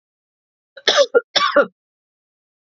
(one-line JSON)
{"cough_length": "2.7 s", "cough_amplitude": 31035, "cough_signal_mean_std_ratio": 0.33, "survey_phase": "beta (2021-08-13 to 2022-03-07)", "age": "45-64", "gender": "Female", "wearing_mask": "No", "symptom_cough_any": true, "symptom_runny_or_blocked_nose": true, "symptom_abdominal_pain": true, "symptom_onset": "12 days", "smoker_status": "Ex-smoker", "respiratory_condition_asthma": false, "respiratory_condition_other": false, "recruitment_source": "REACT", "submission_delay": "1 day", "covid_test_result": "Positive", "covid_test_method": "RT-qPCR", "covid_ct_value": 32.2, "covid_ct_gene": "E gene", "influenza_a_test_result": "Negative", "influenza_b_test_result": "Negative"}